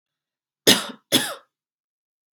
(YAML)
cough_length: 2.3 s
cough_amplitude: 32768
cough_signal_mean_std_ratio: 0.27
survey_phase: beta (2021-08-13 to 2022-03-07)
age: 18-44
gender: Female
wearing_mask: 'Yes'
symptom_cough_any: true
symptom_runny_or_blocked_nose: true
symptom_headache: true
smoker_status: Never smoked
respiratory_condition_asthma: false
respiratory_condition_other: false
recruitment_source: Test and Trace
submission_delay: 1 day
covid_test_result: Positive
covid_test_method: ePCR